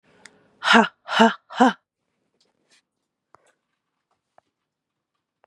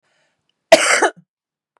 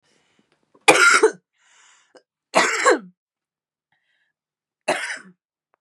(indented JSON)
{
  "exhalation_length": "5.5 s",
  "exhalation_amplitude": 32767,
  "exhalation_signal_mean_std_ratio": 0.24,
  "cough_length": "1.8 s",
  "cough_amplitude": 32768,
  "cough_signal_mean_std_ratio": 0.32,
  "three_cough_length": "5.8 s",
  "three_cough_amplitude": 32768,
  "three_cough_signal_mean_std_ratio": 0.32,
  "survey_phase": "beta (2021-08-13 to 2022-03-07)",
  "age": "18-44",
  "gender": "Female",
  "wearing_mask": "Yes",
  "symptom_cough_any": true,
  "symptom_runny_or_blocked_nose": true,
  "symptom_sore_throat": true,
  "symptom_fatigue": true,
  "symptom_fever_high_temperature": true,
  "symptom_headache": true,
  "symptom_other": true,
  "smoker_status": "Ex-smoker",
  "respiratory_condition_asthma": false,
  "respiratory_condition_other": false,
  "recruitment_source": "Test and Trace",
  "submission_delay": "1 day",
  "covid_test_result": "Positive",
  "covid_test_method": "RT-qPCR",
  "covid_ct_value": 19.9,
  "covid_ct_gene": "ORF1ab gene",
  "covid_ct_mean": 20.3,
  "covid_viral_load": "220000 copies/ml",
  "covid_viral_load_category": "Low viral load (10K-1M copies/ml)"
}